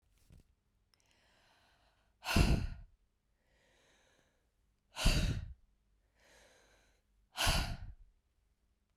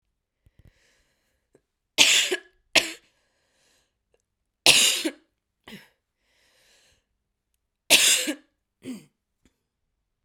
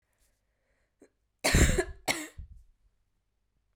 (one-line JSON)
{"exhalation_length": "9.0 s", "exhalation_amplitude": 5647, "exhalation_signal_mean_std_ratio": 0.31, "three_cough_length": "10.2 s", "three_cough_amplitude": 32768, "three_cough_signal_mean_std_ratio": 0.27, "cough_length": "3.8 s", "cough_amplitude": 10574, "cough_signal_mean_std_ratio": 0.3, "survey_phase": "beta (2021-08-13 to 2022-03-07)", "age": "18-44", "gender": "Female", "wearing_mask": "No", "symptom_cough_any": true, "symptom_runny_or_blocked_nose": true, "symptom_shortness_of_breath": true, "symptom_sore_throat": true, "symptom_fatigue": true, "symptom_headache": true, "symptom_change_to_sense_of_smell_or_taste": true, "symptom_onset": "3 days", "smoker_status": "Ex-smoker", "respiratory_condition_asthma": false, "respiratory_condition_other": false, "recruitment_source": "Test and Trace", "submission_delay": "1 day", "covid_test_result": "Positive", "covid_test_method": "RT-qPCR", "covid_ct_value": 22.3, "covid_ct_gene": "N gene"}